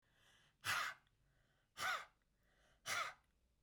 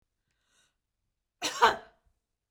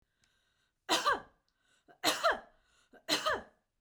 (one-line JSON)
{"exhalation_length": "3.6 s", "exhalation_amplitude": 1177, "exhalation_signal_mean_std_ratio": 0.41, "cough_length": "2.5 s", "cough_amplitude": 11994, "cough_signal_mean_std_ratio": 0.23, "three_cough_length": "3.8 s", "three_cough_amplitude": 5578, "three_cough_signal_mean_std_ratio": 0.38, "survey_phase": "beta (2021-08-13 to 2022-03-07)", "age": "45-64", "gender": "Female", "wearing_mask": "No", "symptom_none": true, "smoker_status": "Never smoked", "respiratory_condition_asthma": false, "respiratory_condition_other": false, "recruitment_source": "REACT", "submission_delay": "1 day", "covid_test_result": "Negative", "covid_test_method": "RT-qPCR"}